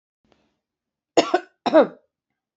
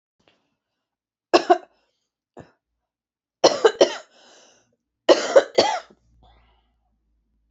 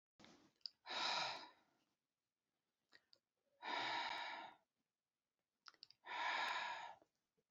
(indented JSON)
{
  "cough_length": "2.6 s",
  "cough_amplitude": 24577,
  "cough_signal_mean_std_ratio": 0.26,
  "three_cough_length": "7.5 s",
  "three_cough_amplitude": 28723,
  "three_cough_signal_mean_std_ratio": 0.25,
  "exhalation_length": "7.5 s",
  "exhalation_amplitude": 974,
  "exhalation_signal_mean_std_ratio": 0.47,
  "survey_phase": "beta (2021-08-13 to 2022-03-07)",
  "age": "65+",
  "gender": "Female",
  "wearing_mask": "No",
  "symptom_cough_any": true,
  "symptom_runny_or_blocked_nose": true,
  "smoker_status": "Never smoked",
  "respiratory_condition_asthma": false,
  "respiratory_condition_other": false,
  "recruitment_source": "REACT",
  "submission_delay": "1 day",
  "covid_test_result": "Negative",
  "covid_test_method": "RT-qPCR",
  "influenza_a_test_result": "Negative",
  "influenza_b_test_result": "Negative"
}